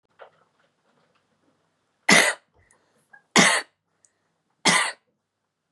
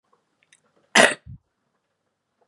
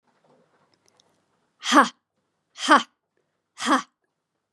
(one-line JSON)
{"three_cough_length": "5.7 s", "three_cough_amplitude": 31357, "three_cough_signal_mean_std_ratio": 0.28, "cough_length": "2.5 s", "cough_amplitude": 32767, "cough_signal_mean_std_ratio": 0.2, "exhalation_length": "4.5 s", "exhalation_amplitude": 30168, "exhalation_signal_mean_std_ratio": 0.25, "survey_phase": "beta (2021-08-13 to 2022-03-07)", "age": "18-44", "gender": "Female", "wearing_mask": "No", "symptom_runny_or_blocked_nose": true, "symptom_onset": "9 days", "smoker_status": "Never smoked", "respiratory_condition_asthma": false, "respiratory_condition_other": false, "recruitment_source": "REACT", "submission_delay": "2 days", "covid_test_result": "Negative", "covid_test_method": "RT-qPCR", "influenza_a_test_result": "Unknown/Void", "influenza_b_test_result": "Unknown/Void"}